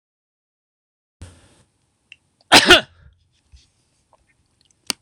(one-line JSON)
{"cough_length": "5.0 s", "cough_amplitude": 26028, "cough_signal_mean_std_ratio": 0.19, "survey_phase": "alpha (2021-03-01 to 2021-08-12)", "age": "65+", "gender": "Male", "wearing_mask": "No", "symptom_none": true, "smoker_status": "Never smoked", "respiratory_condition_asthma": false, "respiratory_condition_other": false, "recruitment_source": "REACT", "submission_delay": "2 days", "covid_test_result": "Negative", "covid_test_method": "RT-qPCR", "covid_ct_value": 43.0, "covid_ct_gene": "N gene"}